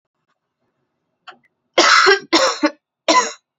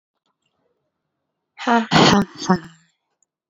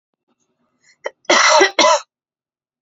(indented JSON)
{
  "three_cough_length": "3.6 s",
  "three_cough_amplitude": 32767,
  "three_cough_signal_mean_std_ratio": 0.42,
  "exhalation_length": "3.5 s",
  "exhalation_amplitude": 32204,
  "exhalation_signal_mean_std_ratio": 0.34,
  "cough_length": "2.8 s",
  "cough_amplitude": 31722,
  "cough_signal_mean_std_ratio": 0.4,
  "survey_phase": "beta (2021-08-13 to 2022-03-07)",
  "age": "18-44",
  "gender": "Female",
  "wearing_mask": "No",
  "symptom_none": true,
  "symptom_onset": "5 days",
  "smoker_status": "Current smoker (1 to 10 cigarettes per day)",
  "respiratory_condition_asthma": false,
  "respiratory_condition_other": false,
  "recruitment_source": "Test and Trace",
  "submission_delay": "2 days",
  "covid_test_result": "Negative",
  "covid_test_method": "RT-qPCR"
}